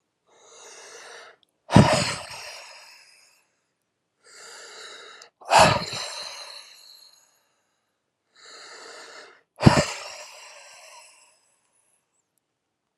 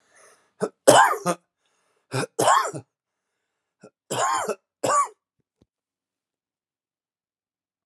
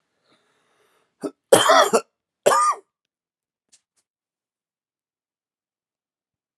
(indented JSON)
{
  "exhalation_length": "13.0 s",
  "exhalation_amplitude": 32767,
  "exhalation_signal_mean_std_ratio": 0.26,
  "three_cough_length": "7.9 s",
  "three_cough_amplitude": 32767,
  "three_cough_signal_mean_std_ratio": 0.32,
  "cough_length": "6.6 s",
  "cough_amplitude": 32754,
  "cough_signal_mean_std_ratio": 0.26,
  "survey_phase": "alpha (2021-03-01 to 2021-08-12)",
  "age": "45-64",
  "gender": "Male",
  "wearing_mask": "No",
  "symptom_cough_any": true,
  "symptom_diarrhoea": true,
  "symptom_fatigue": true,
  "symptom_headache": true,
  "smoker_status": "Ex-smoker",
  "respiratory_condition_asthma": false,
  "respiratory_condition_other": false,
  "recruitment_source": "Test and Trace",
  "submission_delay": "2 days",
  "covid_test_result": "Positive",
  "covid_test_method": "RT-qPCR",
  "covid_ct_value": 29.6,
  "covid_ct_gene": "N gene",
  "covid_ct_mean": 30.0,
  "covid_viral_load": "150 copies/ml",
  "covid_viral_load_category": "Minimal viral load (< 10K copies/ml)"
}